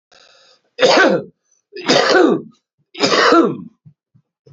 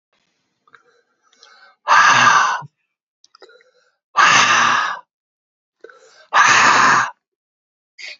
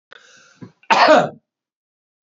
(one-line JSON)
{"three_cough_length": "4.5 s", "three_cough_amplitude": 32768, "three_cough_signal_mean_std_ratio": 0.5, "exhalation_length": "8.2 s", "exhalation_amplitude": 32767, "exhalation_signal_mean_std_ratio": 0.45, "cough_length": "2.3 s", "cough_amplitude": 28253, "cough_signal_mean_std_ratio": 0.34, "survey_phase": "beta (2021-08-13 to 2022-03-07)", "age": "45-64", "gender": "Male", "wearing_mask": "No", "symptom_none": true, "smoker_status": "Current smoker (11 or more cigarettes per day)", "respiratory_condition_asthma": false, "respiratory_condition_other": false, "recruitment_source": "REACT", "submission_delay": "2 days", "covid_test_result": "Negative", "covid_test_method": "RT-qPCR", "influenza_a_test_result": "Negative", "influenza_b_test_result": "Negative"}